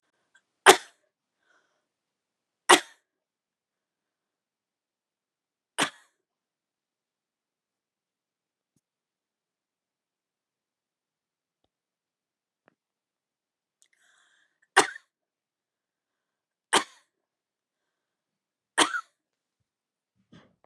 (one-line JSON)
{"three_cough_length": "20.7 s", "three_cough_amplitude": 32767, "three_cough_signal_mean_std_ratio": 0.12, "survey_phase": "beta (2021-08-13 to 2022-03-07)", "age": "45-64", "gender": "Female", "wearing_mask": "No", "symptom_runny_or_blocked_nose": true, "symptom_fatigue": true, "symptom_headache": true, "symptom_change_to_sense_of_smell_or_taste": true, "smoker_status": "Never smoked", "respiratory_condition_asthma": true, "respiratory_condition_other": false, "recruitment_source": "Test and Trace", "submission_delay": "2 days", "covid_test_result": "Positive", "covid_test_method": "ePCR"}